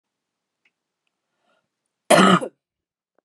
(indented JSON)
{
  "cough_length": "3.2 s",
  "cough_amplitude": 29800,
  "cough_signal_mean_std_ratio": 0.25,
  "survey_phase": "beta (2021-08-13 to 2022-03-07)",
  "age": "45-64",
  "gender": "Female",
  "wearing_mask": "No",
  "symptom_none": true,
  "smoker_status": "Ex-smoker",
  "respiratory_condition_asthma": false,
  "respiratory_condition_other": false,
  "recruitment_source": "REACT",
  "submission_delay": "1 day",
  "covid_test_result": "Negative",
  "covid_test_method": "RT-qPCR",
  "influenza_a_test_result": "Negative",
  "influenza_b_test_result": "Negative"
}